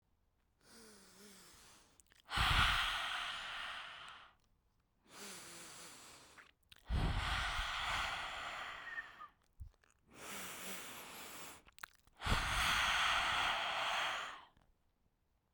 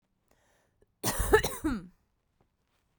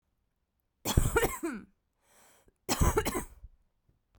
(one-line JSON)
{"exhalation_length": "15.5 s", "exhalation_amplitude": 3711, "exhalation_signal_mean_std_ratio": 0.57, "cough_length": "3.0 s", "cough_amplitude": 13652, "cough_signal_mean_std_ratio": 0.33, "three_cough_length": "4.2 s", "three_cough_amplitude": 11399, "three_cough_signal_mean_std_ratio": 0.39, "survey_phase": "beta (2021-08-13 to 2022-03-07)", "age": "18-44", "gender": "Female", "wearing_mask": "No", "symptom_runny_or_blocked_nose": true, "symptom_diarrhoea": true, "symptom_other": true, "symptom_onset": "12 days", "smoker_status": "Ex-smoker", "respiratory_condition_asthma": true, "respiratory_condition_other": false, "recruitment_source": "REACT", "submission_delay": "2 days", "covid_test_result": "Negative", "covid_test_method": "RT-qPCR"}